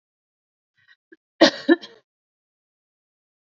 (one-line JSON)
{"cough_length": "3.5 s", "cough_amplitude": 27892, "cough_signal_mean_std_ratio": 0.18, "survey_phase": "beta (2021-08-13 to 2022-03-07)", "age": "18-44", "gender": "Female", "wearing_mask": "No", "symptom_none": true, "smoker_status": "Ex-smoker", "respiratory_condition_asthma": false, "respiratory_condition_other": false, "recruitment_source": "REACT", "submission_delay": "0 days", "covid_test_result": "Negative", "covid_test_method": "RT-qPCR", "influenza_a_test_result": "Negative", "influenza_b_test_result": "Negative"}